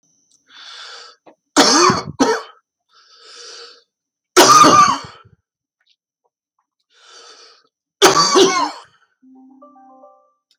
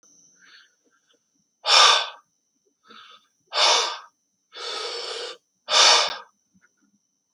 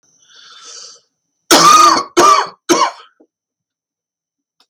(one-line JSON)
{"three_cough_length": "10.6 s", "three_cough_amplitude": 32768, "three_cough_signal_mean_std_ratio": 0.36, "exhalation_length": "7.3 s", "exhalation_amplitude": 26460, "exhalation_signal_mean_std_ratio": 0.36, "cough_length": "4.7 s", "cough_amplitude": 32768, "cough_signal_mean_std_ratio": 0.41, "survey_phase": "alpha (2021-03-01 to 2021-08-12)", "age": "45-64", "gender": "Male", "wearing_mask": "No", "symptom_cough_any": true, "symptom_onset": "4 days", "smoker_status": "Never smoked", "respiratory_condition_asthma": false, "respiratory_condition_other": false, "recruitment_source": "REACT", "submission_delay": "3 days", "covid_test_result": "Negative", "covid_test_method": "RT-qPCR"}